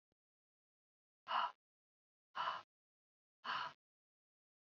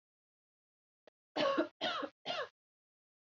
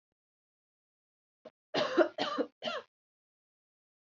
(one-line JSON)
{"exhalation_length": "4.6 s", "exhalation_amplitude": 1642, "exhalation_signal_mean_std_ratio": 0.3, "three_cough_length": "3.3 s", "three_cough_amplitude": 2930, "three_cough_signal_mean_std_ratio": 0.38, "cough_length": "4.2 s", "cough_amplitude": 7186, "cough_signal_mean_std_ratio": 0.3, "survey_phase": "beta (2021-08-13 to 2022-03-07)", "age": "18-44", "gender": "Female", "wearing_mask": "No", "symptom_cough_any": true, "symptom_runny_or_blocked_nose": true, "symptom_sore_throat": true, "symptom_onset": "5 days", "smoker_status": "Never smoked", "respiratory_condition_asthma": false, "respiratory_condition_other": true, "recruitment_source": "Test and Trace", "submission_delay": "1 day", "covid_test_result": "Positive", "covid_test_method": "RT-qPCR", "covid_ct_value": 12.3, "covid_ct_gene": "ORF1ab gene"}